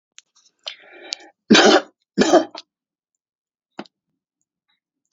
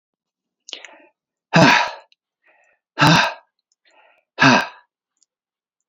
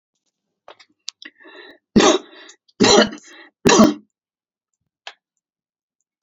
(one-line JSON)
{"cough_length": "5.1 s", "cough_amplitude": 32768, "cough_signal_mean_std_ratio": 0.27, "exhalation_length": "5.9 s", "exhalation_amplitude": 29591, "exhalation_signal_mean_std_ratio": 0.32, "three_cough_length": "6.2 s", "three_cough_amplitude": 31777, "three_cough_signal_mean_std_ratio": 0.3, "survey_phase": "beta (2021-08-13 to 2022-03-07)", "age": "65+", "gender": "Male", "wearing_mask": "No", "symptom_none": true, "smoker_status": "Never smoked", "respiratory_condition_asthma": false, "respiratory_condition_other": false, "recruitment_source": "REACT", "submission_delay": "2 days", "covid_test_result": "Negative", "covid_test_method": "RT-qPCR", "influenza_a_test_result": "Negative", "influenza_b_test_result": "Negative"}